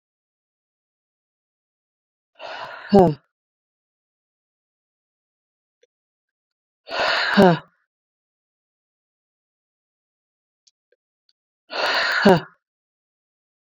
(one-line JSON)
{"exhalation_length": "13.7 s", "exhalation_amplitude": 27680, "exhalation_signal_mean_std_ratio": 0.23, "survey_phase": "beta (2021-08-13 to 2022-03-07)", "age": "18-44", "gender": "Female", "wearing_mask": "No", "symptom_cough_any": true, "symptom_runny_or_blocked_nose": true, "symptom_shortness_of_breath": true, "symptom_fatigue": true, "symptom_change_to_sense_of_smell_or_taste": true, "symptom_other": true, "smoker_status": "Never smoked", "respiratory_condition_asthma": false, "respiratory_condition_other": false, "recruitment_source": "Test and Trace", "submission_delay": "3 days", "covid_test_result": "Positive", "covid_test_method": "RT-qPCR", "covid_ct_value": 27.2, "covid_ct_gene": "N gene"}